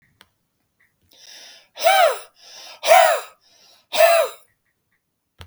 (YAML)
exhalation_length: 5.5 s
exhalation_amplitude: 32080
exhalation_signal_mean_std_ratio: 0.37
survey_phase: beta (2021-08-13 to 2022-03-07)
age: 45-64
gender: Male
wearing_mask: 'No'
symptom_none: true
smoker_status: Ex-smoker
respiratory_condition_asthma: false
respiratory_condition_other: false
recruitment_source: REACT
submission_delay: 0 days
covid_test_result: Negative
covid_test_method: RT-qPCR